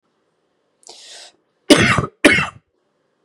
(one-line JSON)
{"cough_length": "3.2 s", "cough_amplitude": 32768, "cough_signal_mean_std_ratio": 0.32, "survey_phase": "beta (2021-08-13 to 2022-03-07)", "age": "18-44", "gender": "Male", "wearing_mask": "No", "symptom_cough_any": true, "symptom_new_continuous_cough": true, "symptom_sore_throat": true, "symptom_fatigue": true, "symptom_fever_high_temperature": true, "smoker_status": "Never smoked", "respiratory_condition_asthma": false, "respiratory_condition_other": false, "recruitment_source": "Test and Trace", "submission_delay": "-1 day", "covid_test_result": "Positive", "covid_test_method": "LFT"}